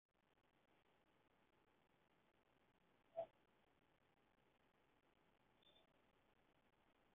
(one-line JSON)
{"exhalation_length": "7.2 s", "exhalation_amplitude": 377, "exhalation_signal_mean_std_ratio": 0.23, "survey_phase": "beta (2021-08-13 to 2022-03-07)", "age": "45-64", "gender": "Male", "wearing_mask": "No", "symptom_none": true, "smoker_status": "Ex-smoker", "respiratory_condition_asthma": false, "respiratory_condition_other": false, "recruitment_source": "REACT", "submission_delay": "2 days", "covid_test_result": "Negative", "covid_test_method": "RT-qPCR", "influenza_a_test_result": "Unknown/Void", "influenza_b_test_result": "Unknown/Void"}